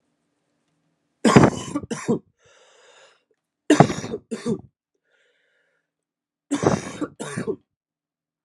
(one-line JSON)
{"three_cough_length": "8.4 s", "three_cough_amplitude": 32768, "three_cough_signal_mean_std_ratio": 0.29, "survey_phase": "alpha (2021-03-01 to 2021-08-12)", "age": "18-44", "gender": "Male", "wearing_mask": "No", "symptom_cough_any": true, "symptom_new_continuous_cough": true, "symptom_fever_high_temperature": true, "symptom_headache": true, "symptom_change_to_sense_of_smell_or_taste": true, "symptom_loss_of_taste": true, "smoker_status": "Never smoked", "respiratory_condition_asthma": false, "respiratory_condition_other": false, "recruitment_source": "Test and Trace", "submission_delay": "1 day", "covid_test_result": "Positive", "covid_test_method": "RT-qPCR"}